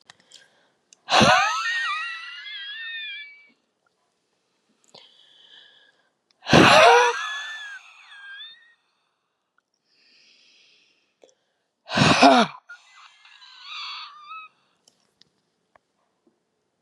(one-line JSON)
{"exhalation_length": "16.8 s", "exhalation_amplitude": 30674, "exhalation_signal_mean_std_ratio": 0.31, "survey_phase": "beta (2021-08-13 to 2022-03-07)", "age": "65+", "gender": "Female", "wearing_mask": "No", "symptom_none": true, "smoker_status": "Ex-smoker", "respiratory_condition_asthma": false, "respiratory_condition_other": false, "recruitment_source": "REACT", "submission_delay": "1 day", "covid_test_result": "Negative", "covid_test_method": "RT-qPCR", "influenza_a_test_result": "Unknown/Void", "influenza_b_test_result": "Unknown/Void"}